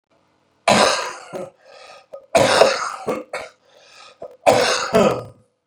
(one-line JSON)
{"three_cough_length": "5.7 s", "three_cough_amplitude": 32768, "three_cough_signal_mean_std_ratio": 0.46, "survey_phase": "beta (2021-08-13 to 2022-03-07)", "age": "45-64", "gender": "Male", "wearing_mask": "No", "symptom_none": true, "smoker_status": "Ex-smoker", "respiratory_condition_asthma": false, "respiratory_condition_other": false, "recruitment_source": "REACT", "submission_delay": "1 day", "covid_test_result": "Negative", "covid_test_method": "RT-qPCR", "influenza_a_test_result": "Negative", "influenza_b_test_result": "Negative"}